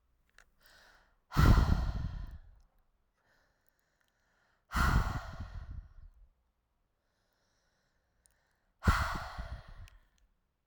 {"exhalation_length": "10.7 s", "exhalation_amplitude": 7813, "exhalation_signal_mean_std_ratio": 0.33, "survey_phase": "alpha (2021-03-01 to 2021-08-12)", "age": "18-44", "gender": "Female", "wearing_mask": "No", "symptom_cough_any": true, "symptom_change_to_sense_of_smell_or_taste": true, "symptom_loss_of_taste": true, "symptom_onset": "6 days", "smoker_status": "Current smoker (1 to 10 cigarettes per day)", "respiratory_condition_asthma": false, "respiratory_condition_other": false, "recruitment_source": "Test and Trace", "submission_delay": "2 days", "covid_test_result": "Positive", "covid_test_method": "RT-qPCR", "covid_ct_value": 18.3, "covid_ct_gene": "ORF1ab gene", "covid_ct_mean": 18.6, "covid_viral_load": "820000 copies/ml", "covid_viral_load_category": "Low viral load (10K-1M copies/ml)"}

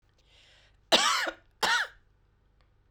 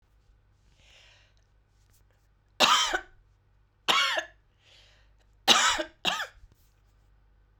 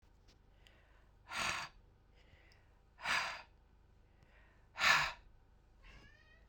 {"cough_length": "2.9 s", "cough_amplitude": 14638, "cough_signal_mean_std_ratio": 0.38, "three_cough_length": "7.6 s", "three_cough_amplitude": 21857, "three_cough_signal_mean_std_ratio": 0.32, "exhalation_length": "6.5 s", "exhalation_amplitude": 6210, "exhalation_signal_mean_std_ratio": 0.34, "survey_phase": "beta (2021-08-13 to 2022-03-07)", "age": "65+", "gender": "Female", "wearing_mask": "No", "symptom_none": true, "smoker_status": "Ex-smoker", "respiratory_condition_asthma": true, "respiratory_condition_other": false, "recruitment_source": "REACT", "submission_delay": "2 days", "covid_test_result": "Negative", "covid_test_method": "RT-qPCR", "influenza_a_test_result": "Negative", "influenza_b_test_result": "Negative"}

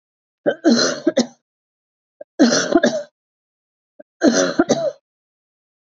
{"three_cough_length": "5.9 s", "three_cough_amplitude": 32768, "three_cough_signal_mean_std_ratio": 0.42, "survey_phase": "beta (2021-08-13 to 2022-03-07)", "age": "45-64", "gender": "Female", "wearing_mask": "No", "symptom_cough_any": true, "symptom_runny_or_blocked_nose": true, "symptom_fatigue": true, "symptom_headache": true, "symptom_change_to_sense_of_smell_or_taste": true, "smoker_status": "Ex-smoker", "respiratory_condition_asthma": false, "respiratory_condition_other": false, "recruitment_source": "Test and Trace", "submission_delay": "1 day", "covid_test_result": "Positive", "covid_test_method": "RT-qPCR", "covid_ct_value": 19.7, "covid_ct_gene": "ORF1ab gene", "covid_ct_mean": 20.7, "covid_viral_load": "170000 copies/ml", "covid_viral_load_category": "Low viral load (10K-1M copies/ml)"}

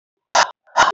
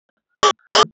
{"exhalation_length": "0.9 s", "exhalation_amplitude": 27348, "exhalation_signal_mean_std_ratio": 0.43, "three_cough_length": "0.9 s", "three_cough_amplitude": 30024, "three_cough_signal_mean_std_ratio": 0.36, "survey_phase": "beta (2021-08-13 to 2022-03-07)", "age": "45-64", "gender": "Female", "wearing_mask": "No", "symptom_none": true, "smoker_status": "Never smoked", "respiratory_condition_asthma": false, "respiratory_condition_other": false, "recruitment_source": "REACT", "submission_delay": "0 days", "covid_test_result": "Negative", "covid_test_method": "RT-qPCR"}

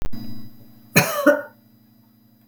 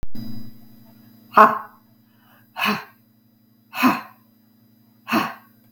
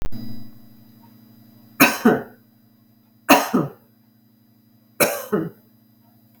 {"cough_length": "2.5 s", "cough_amplitude": 32767, "cough_signal_mean_std_ratio": 0.48, "exhalation_length": "5.7 s", "exhalation_amplitude": 32768, "exhalation_signal_mean_std_ratio": 0.35, "three_cough_length": "6.4 s", "three_cough_amplitude": 32768, "three_cough_signal_mean_std_ratio": 0.37, "survey_phase": "beta (2021-08-13 to 2022-03-07)", "age": "65+", "gender": "Female", "wearing_mask": "No", "symptom_none": true, "smoker_status": "Never smoked", "respiratory_condition_asthma": false, "respiratory_condition_other": false, "recruitment_source": "REACT", "submission_delay": "2 days", "covid_test_result": "Negative", "covid_test_method": "RT-qPCR"}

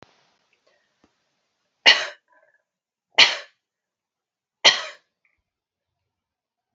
{"three_cough_length": "6.7 s", "three_cough_amplitude": 29664, "three_cough_signal_mean_std_ratio": 0.19, "survey_phase": "beta (2021-08-13 to 2022-03-07)", "age": "18-44", "gender": "Female", "wearing_mask": "No", "symptom_sore_throat": true, "symptom_onset": "4 days", "smoker_status": "Never smoked", "respiratory_condition_asthma": false, "respiratory_condition_other": false, "recruitment_source": "REACT", "submission_delay": "1 day", "covid_test_result": "Negative", "covid_test_method": "RT-qPCR"}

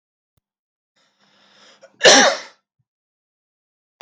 {"cough_length": "4.0 s", "cough_amplitude": 32768, "cough_signal_mean_std_ratio": 0.23, "survey_phase": "beta (2021-08-13 to 2022-03-07)", "age": "45-64", "gender": "Male", "wearing_mask": "No", "symptom_none": true, "smoker_status": "Never smoked", "recruitment_source": "REACT", "submission_delay": "2 days", "covid_test_result": "Negative", "covid_test_method": "RT-qPCR", "influenza_a_test_result": "Negative", "influenza_b_test_result": "Negative"}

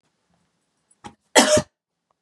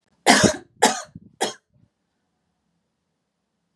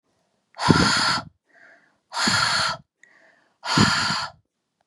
{"cough_length": "2.2 s", "cough_amplitude": 32657, "cough_signal_mean_std_ratio": 0.27, "three_cough_length": "3.8 s", "three_cough_amplitude": 32751, "three_cough_signal_mean_std_ratio": 0.27, "exhalation_length": "4.9 s", "exhalation_amplitude": 32552, "exhalation_signal_mean_std_ratio": 0.51, "survey_phase": "beta (2021-08-13 to 2022-03-07)", "age": "18-44", "gender": "Female", "wearing_mask": "No", "symptom_runny_or_blocked_nose": true, "symptom_onset": "10 days", "smoker_status": "Never smoked", "respiratory_condition_asthma": false, "respiratory_condition_other": false, "recruitment_source": "REACT", "submission_delay": "3 days", "covid_test_result": "Negative", "covid_test_method": "RT-qPCR", "influenza_a_test_result": "Negative", "influenza_b_test_result": "Negative"}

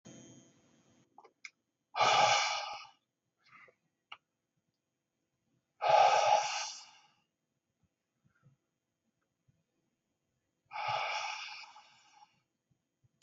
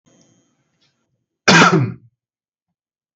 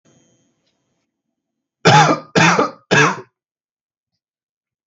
{"exhalation_length": "13.2 s", "exhalation_amplitude": 6340, "exhalation_signal_mean_std_ratio": 0.32, "cough_length": "3.2 s", "cough_amplitude": 32768, "cough_signal_mean_std_ratio": 0.3, "three_cough_length": "4.9 s", "three_cough_amplitude": 32768, "three_cough_signal_mean_std_ratio": 0.35, "survey_phase": "beta (2021-08-13 to 2022-03-07)", "age": "18-44", "gender": "Male", "wearing_mask": "No", "symptom_none": true, "symptom_onset": "13 days", "smoker_status": "Never smoked", "respiratory_condition_asthma": false, "respiratory_condition_other": false, "recruitment_source": "REACT", "submission_delay": "3 days", "covid_test_result": "Negative", "covid_test_method": "RT-qPCR", "influenza_a_test_result": "Negative", "influenza_b_test_result": "Negative"}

